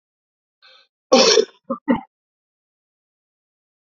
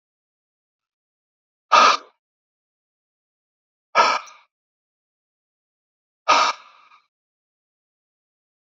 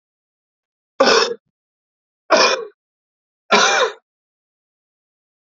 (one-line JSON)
{"cough_length": "3.9 s", "cough_amplitude": 32768, "cough_signal_mean_std_ratio": 0.27, "exhalation_length": "8.6 s", "exhalation_amplitude": 28835, "exhalation_signal_mean_std_ratio": 0.23, "three_cough_length": "5.5 s", "three_cough_amplitude": 29739, "three_cough_signal_mean_std_ratio": 0.34, "survey_phase": "alpha (2021-03-01 to 2021-08-12)", "age": "18-44", "gender": "Male", "wearing_mask": "No", "symptom_cough_any": true, "symptom_fatigue": true, "symptom_headache": true, "symptom_change_to_sense_of_smell_or_taste": true, "symptom_onset": "4 days", "smoker_status": "Never smoked", "respiratory_condition_asthma": false, "respiratory_condition_other": false, "recruitment_source": "Test and Trace", "submission_delay": "1 day", "covid_test_result": "Positive", "covid_test_method": "RT-qPCR", "covid_ct_value": 20.0, "covid_ct_gene": "ORF1ab gene"}